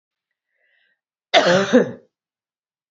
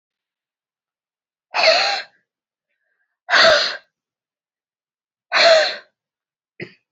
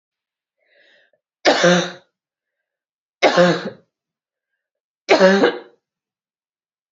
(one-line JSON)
{"cough_length": "2.9 s", "cough_amplitude": 28829, "cough_signal_mean_std_ratio": 0.33, "exhalation_length": "6.9 s", "exhalation_amplitude": 28832, "exhalation_signal_mean_std_ratio": 0.35, "three_cough_length": "6.9 s", "three_cough_amplitude": 31206, "three_cough_signal_mean_std_ratio": 0.34, "survey_phase": "beta (2021-08-13 to 2022-03-07)", "age": "45-64", "gender": "Female", "wearing_mask": "No", "symptom_cough_any": true, "symptom_runny_or_blocked_nose": true, "symptom_sore_throat": true, "symptom_fatigue": true, "symptom_headache": true, "symptom_change_to_sense_of_smell_or_taste": true, "symptom_onset": "3 days", "smoker_status": "Never smoked", "respiratory_condition_asthma": false, "respiratory_condition_other": false, "recruitment_source": "Test and Trace", "submission_delay": "1 day", "covid_test_result": "Negative", "covid_test_method": "RT-qPCR"}